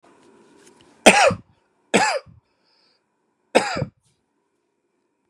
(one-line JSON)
{"three_cough_length": "5.3 s", "three_cough_amplitude": 32768, "three_cough_signal_mean_std_ratio": 0.27, "survey_phase": "beta (2021-08-13 to 2022-03-07)", "age": "18-44", "gender": "Male", "wearing_mask": "No", "symptom_cough_any": true, "symptom_runny_or_blocked_nose": true, "symptom_sore_throat": true, "symptom_fatigue": true, "symptom_onset": "2 days", "smoker_status": "Ex-smoker", "respiratory_condition_asthma": false, "respiratory_condition_other": false, "recruitment_source": "Test and Trace", "submission_delay": "2 days", "covid_test_result": "Positive", "covid_test_method": "RT-qPCR", "covid_ct_value": 17.1, "covid_ct_gene": "ORF1ab gene", "covid_ct_mean": 17.6, "covid_viral_load": "1700000 copies/ml", "covid_viral_load_category": "High viral load (>1M copies/ml)"}